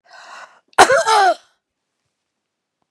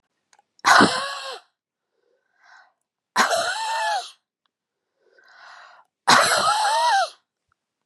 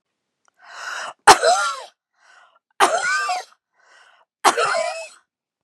{"cough_length": "2.9 s", "cough_amplitude": 32768, "cough_signal_mean_std_ratio": 0.35, "exhalation_length": "7.9 s", "exhalation_amplitude": 29215, "exhalation_signal_mean_std_ratio": 0.44, "three_cough_length": "5.6 s", "three_cough_amplitude": 32768, "three_cough_signal_mean_std_ratio": 0.39, "survey_phase": "beta (2021-08-13 to 2022-03-07)", "age": "45-64", "gender": "Female", "wearing_mask": "No", "symptom_headache": true, "symptom_onset": "12 days", "smoker_status": "Ex-smoker", "respiratory_condition_asthma": false, "respiratory_condition_other": false, "recruitment_source": "REACT", "submission_delay": "2 days", "covid_test_result": "Negative", "covid_test_method": "RT-qPCR"}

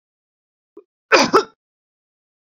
{"cough_length": "2.5 s", "cough_amplitude": 27904, "cough_signal_mean_std_ratio": 0.25, "survey_phase": "beta (2021-08-13 to 2022-03-07)", "age": "65+", "gender": "Male", "wearing_mask": "No", "symptom_none": true, "smoker_status": "Never smoked", "respiratory_condition_asthma": false, "respiratory_condition_other": false, "recruitment_source": "REACT", "submission_delay": "2 days", "covid_test_result": "Negative", "covid_test_method": "RT-qPCR"}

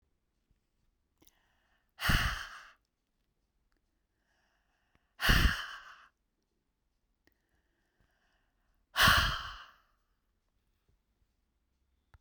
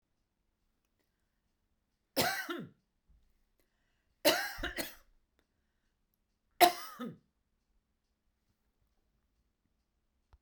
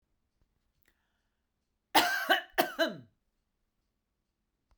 {"exhalation_length": "12.2 s", "exhalation_amplitude": 10341, "exhalation_signal_mean_std_ratio": 0.25, "three_cough_length": "10.4 s", "three_cough_amplitude": 17657, "three_cough_signal_mean_std_ratio": 0.21, "cough_length": "4.8 s", "cough_amplitude": 11280, "cough_signal_mean_std_ratio": 0.28, "survey_phase": "beta (2021-08-13 to 2022-03-07)", "age": "45-64", "gender": "Female", "wearing_mask": "No", "symptom_sore_throat": true, "smoker_status": "Ex-smoker", "respiratory_condition_asthma": false, "respiratory_condition_other": false, "recruitment_source": "REACT", "submission_delay": "2 days", "covid_test_method": "RT-qPCR"}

